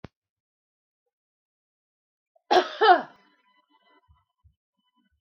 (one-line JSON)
{"cough_length": "5.2 s", "cough_amplitude": 19266, "cough_signal_mean_std_ratio": 0.2, "survey_phase": "beta (2021-08-13 to 2022-03-07)", "age": "45-64", "gender": "Female", "wearing_mask": "No", "symptom_none": true, "smoker_status": "Ex-smoker", "respiratory_condition_asthma": false, "respiratory_condition_other": false, "recruitment_source": "REACT", "submission_delay": "1 day", "covid_test_result": "Negative", "covid_test_method": "RT-qPCR", "influenza_a_test_result": "Unknown/Void", "influenza_b_test_result": "Unknown/Void"}